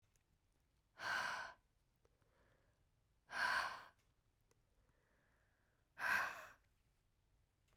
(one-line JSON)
{"exhalation_length": "7.8 s", "exhalation_amplitude": 1374, "exhalation_signal_mean_std_ratio": 0.35, "survey_phase": "beta (2021-08-13 to 2022-03-07)", "age": "18-44", "gender": "Female", "wearing_mask": "Yes", "symptom_fatigue": true, "symptom_fever_high_temperature": true, "symptom_onset": "3 days", "smoker_status": "Never smoked", "respiratory_condition_asthma": false, "respiratory_condition_other": false, "recruitment_source": "Test and Trace", "submission_delay": "2 days", "covid_test_result": "Positive", "covid_test_method": "RT-qPCR", "covid_ct_value": 18.8, "covid_ct_gene": "ORF1ab gene", "covid_ct_mean": 19.0, "covid_viral_load": "580000 copies/ml", "covid_viral_load_category": "Low viral load (10K-1M copies/ml)"}